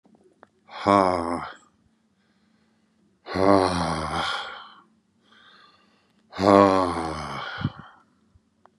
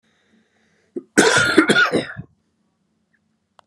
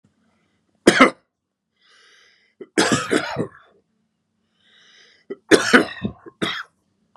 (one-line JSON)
{"exhalation_length": "8.8 s", "exhalation_amplitude": 26101, "exhalation_signal_mean_std_ratio": 0.38, "cough_length": "3.7 s", "cough_amplitude": 32768, "cough_signal_mean_std_ratio": 0.39, "three_cough_length": "7.2 s", "three_cough_amplitude": 32768, "three_cough_signal_mean_std_ratio": 0.29, "survey_phase": "beta (2021-08-13 to 2022-03-07)", "age": "45-64", "gender": "Male", "wearing_mask": "No", "symptom_cough_any": true, "symptom_runny_or_blocked_nose": true, "symptom_shortness_of_breath": true, "symptom_fatigue": true, "symptom_headache": true, "smoker_status": "Current smoker (11 or more cigarettes per day)", "respiratory_condition_asthma": false, "respiratory_condition_other": false, "recruitment_source": "REACT", "submission_delay": "1 day", "covid_test_result": "Negative", "covid_test_method": "RT-qPCR", "influenza_a_test_result": "Unknown/Void", "influenza_b_test_result": "Unknown/Void"}